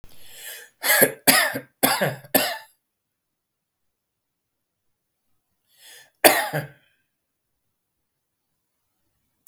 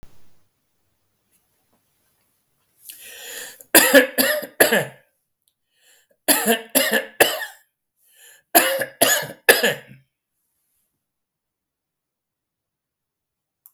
{"cough_length": "9.5 s", "cough_amplitude": 32767, "cough_signal_mean_std_ratio": 0.29, "three_cough_length": "13.7 s", "three_cough_amplitude": 32768, "three_cough_signal_mean_std_ratio": 0.31, "survey_phase": "beta (2021-08-13 to 2022-03-07)", "age": "65+", "gender": "Male", "wearing_mask": "No", "symptom_none": true, "smoker_status": "Ex-smoker", "respiratory_condition_asthma": false, "respiratory_condition_other": false, "recruitment_source": "REACT", "submission_delay": "2 days", "covid_test_result": "Negative", "covid_test_method": "RT-qPCR", "influenza_a_test_result": "Negative", "influenza_b_test_result": "Negative"}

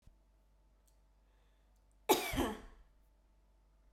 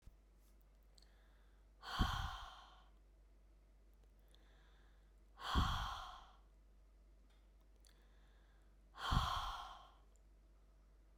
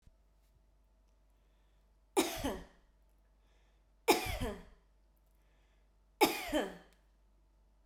{"cough_length": "3.9 s", "cough_amplitude": 6393, "cough_signal_mean_std_ratio": 0.28, "exhalation_length": "11.2 s", "exhalation_amplitude": 2674, "exhalation_signal_mean_std_ratio": 0.4, "three_cough_length": "7.9 s", "three_cough_amplitude": 8474, "three_cough_signal_mean_std_ratio": 0.3, "survey_phase": "beta (2021-08-13 to 2022-03-07)", "age": "45-64", "gender": "Female", "wearing_mask": "No", "symptom_none": true, "smoker_status": "Never smoked", "respiratory_condition_asthma": false, "respiratory_condition_other": false, "recruitment_source": "REACT", "submission_delay": "1 day", "covid_test_result": "Negative", "covid_test_method": "RT-qPCR"}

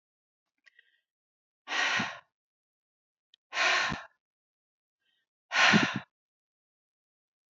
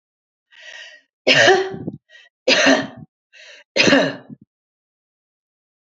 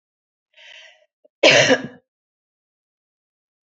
{"exhalation_length": "7.5 s", "exhalation_amplitude": 10268, "exhalation_signal_mean_std_ratio": 0.31, "three_cough_length": "5.9 s", "three_cough_amplitude": 30445, "three_cough_signal_mean_std_ratio": 0.38, "cough_length": "3.7 s", "cough_amplitude": 29873, "cough_signal_mean_std_ratio": 0.26, "survey_phase": "beta (2021-08-13 to 2022-03-07)", "age": "65+", "gender": "Female", "wearing_mask": "No", "symptom_none": true, "smoker_status": "Never smoked", "respiratory_condition_asthma": false, "respiratory_condition_other": false, "recruitment_source": "REACT", "submission_delay": "3 days", "covid_test_result": "Negative", "covid_test_method": "RT-qPCR"}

